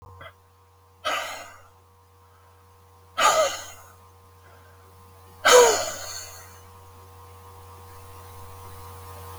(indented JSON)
{
  "exhalation_length": "9.4 s",
  "exhalation_amplitude": 26169,
  "exhalation_signal_mean_std_ratio": 0.32,
  "survey_phase": "beta (2021-08-13 to 2022-03-07)",
  "age": "65+",
  "gender": "Male",
  "wearing_mask": "No",
  "symptom_none": true,
  "smoker_status": "Never smoked",
  "respiratory_condition_asthma": false,
  "respiratory_condition_other": false,
  "recruitment_source": "REACT",
  "submission_delay": "0 days",
  "covid_test_result": "Negative",
  "covid_test_method": "RT-qPCR",
  "influenza_a_test_result": "Negative",
  "influenza_b_test_result": "Negative"
}